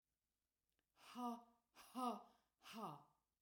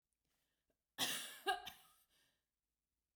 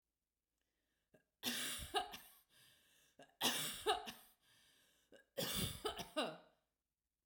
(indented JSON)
{
  "exhalation_length": "3.4 s",
  "exhalation_amplitude": 697,
  "exhalation_signal_mean_std_ratio": 0.42,
  "cough_length": "3.2 s",
  "cough_amplitude": 1833,
  "cough_signal_mean_std_ratio": 0.31,
  "three_cough_length": "7.3 s",
  "three_cough_amplitude": 2558,
  "three_cough_signal_mean_std_ratio": 0.43,
  "survey_phase": "beta (2021-08-13 to 2022-03-07)",
  "age": "45-64",
  "gender": "Female",
  "wearing_mask": "No",
  "symptom_none": true,
  "smoker_status": "Never smoked",
  "respiratory_condition_asthma": false,
  "respiratory_condition_other": false,
  "recruitment_source": "REACT",
  "submission_delay": "2 days",
  "covid_test_result": "Negative",
  "covid_test_method": "RT-qPCR",
  "influenza_a_test_result": "Negative",
  "influenza_b_test_result": "Negative"
}